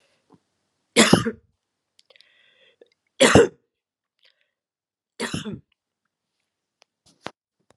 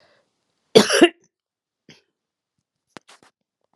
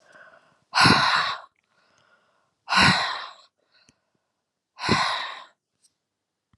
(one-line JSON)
{"three_cough_length": "7.8 s", "three_cough_amplitude": 32767, "three_cough_signal_mean_std_ratio": 0.22, "cough_length": "3.8 s", "cough_amplitude": 32768, "cough_signal_mean_std_ratio": 0.2, "exhalation_length": "6.6 s", "exhalation_amplitude": 23918, "exhalation_signal_mean_std_ratio": 0.38, "survey_phase": "beta (2021-08-13 to 2022-03-07)", "age": "65+", "gender": "Female", "wearing_mask": "No", "symptom_fatigue": true, "symptom_headache": true, "smoker_status": "Never smoked", "respiratory_condition_asthma": false, "respiratory_condition_other": false, "recruitment_source": "Test and Trace", "submission_delay": "2 days", "covid_test_result": "Positive", "covid_test_method": "ePCR"}